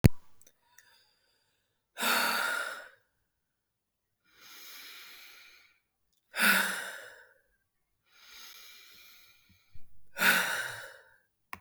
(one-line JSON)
{"exhalation_length": "11.6 s", "exhalation_amplitude": 27141, "exhalation_signal_mean_std_ratio": 0.34, "survey_phase": "alpha (2021-03-01 to 2021-08-12)", "age": "18-44", "gender": "Female", "wearing_mask": "No", "symptom_none": true, "smoker_status": "Never smoked", "respiratory_condition_asthma": false, "respiratory_condition_other": false, "recruitment_source": "REACT", "submission_delay": "1 day", "covid_test_result": "Negative", "covid_test_method": "RT-qPCR"}